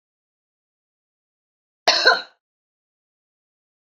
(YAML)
cough_length: 3.8 s
cough_amplitude: 29781
cough_signal_mean_std_ratio: 0.21
survey_phase: beta (2021-08-13 to 2022-03-07)
age: 45-64
gender: Female
wearing_mask: 'No'
symptom_cough_any: true
symptom_runny_or_blocked_nose: true
symptom_onset: 3 days
smoker_status: Ex-smoker
respiratory_condition_asthma: false
respiratory_condition_other: false
recruitment_source: Test and Trace
submission_delay: 2 days
covid_test_result: Positive
covid_test_method: RT-qPCR
covid_ct_value: 15.9
covid_ct_gene: ORF1ab gene
covid_ct_mean: 16.1
covid_viral_load: 5300000 copies/ml
covid_viral_load_category: High viral load (>1M copies/ml)